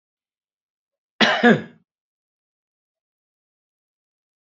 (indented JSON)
{
  "cough_length": "4.4 s",
  "cough_amplitude": 28927,
  "cough_signal_mean_std_ratio": 0.21,
  "survey_phase": "beta (2021-08-13 to 2022-03-07)",
  "age": "65+",
  "gender": "Male",
  "wearing_mask": "No",
  "symptom_none": true,
  "smoker_status": "Never smoked",
  "respiratory_condition_asthma": false,
  "respiratory_condition_other": false,
  "recruitment_source": "REACT",
  "submission_delay": "3 days",
  "covid_test_result": "Negative",
  "covid_test_method": "RT-qPCR"
}